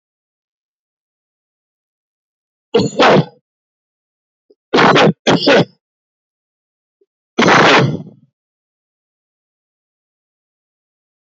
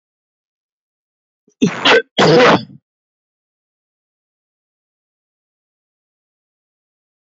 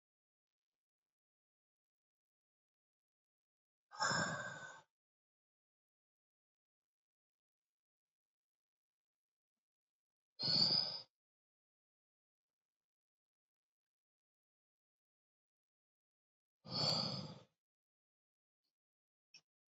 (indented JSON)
{
  "three_cough_length": "11.3 s",
  "three_cough_amplitude": 30854,
  "three_cough_signal_mean_std_ratio": 0.33,
  "cough_length": "7.3 s",
  "cough_amplitude": 31111,
  "cough_signal_mean_std_ratio": 0.26,
  "exhalation_length": "19.7 s",
  "exhalation_amplitude": 2969,
  "exhalation_signal_mean_std_ratio": 0.23,
  "survey_phase": "beta (2021-08-13 to 2022-03-07)",
  "age": "45-64",
  "gender": "Male",
  "wearing_mask": "No",
  "symptom_none": true,
  "smoker_status": "Ex-smoker",
  "respiratory_condition_asthma": false,
  "respiratory_condition_other": false,
  "recruitment_source": "REACT",
  "submission_delay": "2 days",
  "covid_test_result": "Negative",
  "covid_test_method": "RT-qPCR"
}